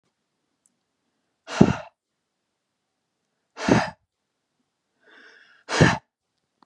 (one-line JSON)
{"exhalation_length": "6.7 s", "exhalation_amplitude": 32730, "exhalation_signal_mean_std_ratio": 0.22, "survey_phase": "beta (2021-08-13 to 2022-03-07)", "age": "45-64", "gender": "Male", "wearing_mask": "No", "symptom_none": true, "smoker_status": "Never smoked", "respiratory_condition_asthma": true, "respiratory_condition_other": false, "recruitment_source": "REACT", "submission_delay": "1 day", "covid_test_result": "Negative", "covid_test_method": "RT-qPCR", "influenza_a_test_result": "Negative", "influenza_b_test_result": "Negative"}